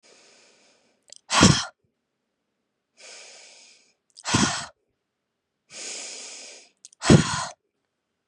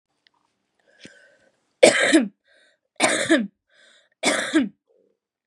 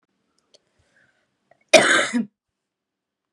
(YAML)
exhalation_length: 8.3 s
exhalation_amplitude: 28009
exhalation_signal_mean_std_ratio: 0.27
three_cough_length: 5.5 s
three_cough_amplitude: 32768
three_cough_signal_mean_std_ratio: 0.36
cough_length: 3.3 s
cough_amplitude: 32767
cough_signal_mean_std_ratio: 0.27
survey_phase: beta (2021-08-13 to 2022-03-07)
age: 18-44
gender: Female
wearing_mask: 'No'
symptom_cough_any: true
symptom_runny_or_blocked_nose: true
symptom_fatigue: true
symptom_onset: 4 days
smoker_status: Never smoked
respiratory_condition_asthma: false
respiratory_condition_other: false
recruitment_source: Test and Trace
submission_delay: 1 day
covid_test_result: Positive
covid_test_method: RT-qPCR
covid_ct_value: 24.5
covid_ct_gene: N gene